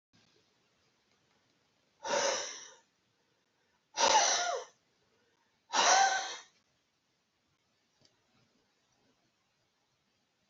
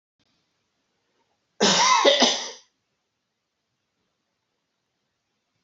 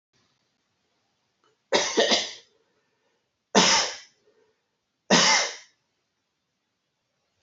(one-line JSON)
{"exhalation_length": "10.5 s", "exhalation_amplitude": 6925, "exhalation_signal_mean_std_ratio": 0.31, "cough_length": "5.6 s", "cough_amplitude": 24356, "cough_signal_mean_std_ratio": 0.31, "three_cough_length": "7.4 s", "three_cough_amplitude": 23681, "three_cough_signal_mean_std_ratio": 0.33, "survey_phase": "beta (2021-08-13 to 2022-03-07)", "age": "65+", "gender": "Male", "wearing_mask": "No", "symptom_none": true, "smoker_status": "Ex-smoker", "respiratory_condition_asthma": false, "respiratory_condition_other": false, "recruitment_source": "REACT", "submission_delay": "2 days", "covid_test_result": "Negative", "covid_test_method": "RT-qPCR"}